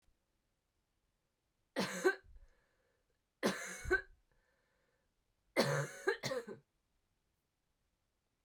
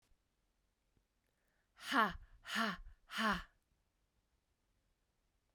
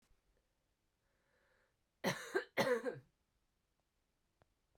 {"three_cough_length": "8.4 s", "three_cough_amplitude": 4059, "three_cough_signal_mean_std_ratio": 0.31, "exhalation_length": "5.5 s", "exhalation_amplitude": 3710, "exhalation_signal_mean_std_ratio": 0.31, "cough_length": "4.8 s", "cough_amplitude": 3641, "cough_signal_mean_std_ratio": 0.29, "survey_phase": "beta (2021-08-13 to 2022-03-07)", "age": "18-44", "gender": "Female", "wearing_mask": "No", "symptom_cough_any": true, "symptom_fatigue": true, "symptom_headache": true, "symptom_change_to_sense_of_smell_or_taste": true, "symptom_loss_of_taste": true, "symptom_onset": "4 days", "smoker_status": "Never smoked", "respiratory_condition_asthma": false, "respiratory_condition_other": false, "recruitment_source": "Test and Trace", "submission_delay": "2 days", "covid_test_result": "Positive", "covid_test_method": "RT-qPCR", "covid_ct_value": 19.1, "covid_ct_gene": "ORF1ab gene", "covid_ct_mean": 19.7, "covid_viral_load": "350000 copies/ml", "covid_viral_load_category": "Low viral load (10K-1M copies/ml)"}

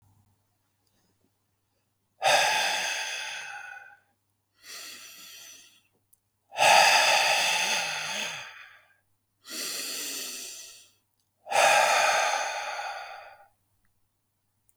{"exhalation_length": "14.8 s", "exhalation_amplitude": 16540, "exhalation_signal_mean_std_ratio": 0.47, "survey_phase": "beta (2021-08-13 to 2022-03-07)", "age": "45-64", "gender": "Male", "wearing_mask": "No", "symptom_none": true, "smoker_status": "Never smoked", "respiratory_condition_asthma": false, "respiratory_condition_other": false, "recruitment_source": "REACT", "submission_delay": "2 days", "covid_test_result": "Negative", "covid_test_method": "RT-qPCR", "influenza_a_test_result": "Negative", "influenza_b_test_result": "Negative"}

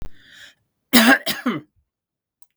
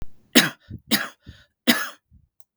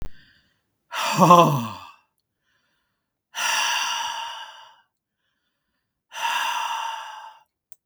{"cough_length": "2.6 s", "cough_amplitude": 32768, "cough_signal_mean_std_ratio": 0.35, "three_cough_length": "2.6 s", "three_cough_amplitude": 32768, "three_cough_signal_mean_std_ratio": 0.33, "exhalation_length": "7.9 s", "exhalation_amplitude": 32768, "exhalation_signal_mean_std_ratio": 0.4, "survey_phase": "beta (2021-08-13 to 2022-03-07)", "age": "65+", "gender": "Male", "wearing_mask": "No", "symptom_none": true, "smoker_status": "Never smoked", "respiratory_condition_asthma": false, "respiratory_condition_other": false, "recruitment_source": "REACT", "submission_delay": "1 day", "covid_test_result": "Negative", "covid_test_method": "RT-qPCR", "influenza_a_test_result": "Negative", "influenza_b_test_result": "Negative"}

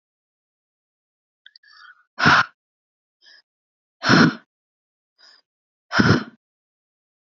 {"exhalation_length": "7.3 s", "exhalation_amplitude": 27364, "exhalation_signal_mean_std_ratio": 0.26, "survey_phase": "beta (2021-08-13 to 2022-03-07)", "age": "18-44", "gender": "Female", "wearing_mask": "No", "symptom_none": true, "smoker_status": "Current smoker (e-cigarettes or vapes only)", "respiratory_condition_asthma": true, "respiratory_condition_other": false, "recruitment_source": "Test and Trace", "submission_delay": "1 day", "covid_test_result": "Negative", "covid_test_method": "RT-qPCR"}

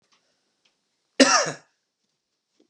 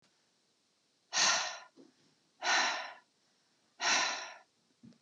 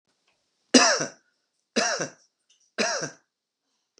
{"cough_length": "2.7 s", "cough_amplitude": 32137, "cough_signal_mean_std_ratio": 0.24, "exhalation_length": "5.0 s", "exhalation_amplitude": 5034, "exhalation_signal_mean_std_ratio": 0.42, "three_cough_length": "4.0 s", "three_cough_amplitude": 25882, "three_cough_signal_mean_std_ratio": 0.33, "survey_phase": "beta (2021-08-13 to 2022-03-07)", "age": "45-64", "gender": "Male", "wearing_mask": "No", "symptom_none": true, "smoker_status": "Never smoked", "respiratory_condition_asthma": false, "respiratory_condition_other": false, "recruitment_source": "REACT", "submission_delay": "0 days", "covid_test_result": "Negative", "covid_test_method": "RT-qPCR", "influenza_a_test_result": "Negative", "influenza_b_test_result": "Negative"}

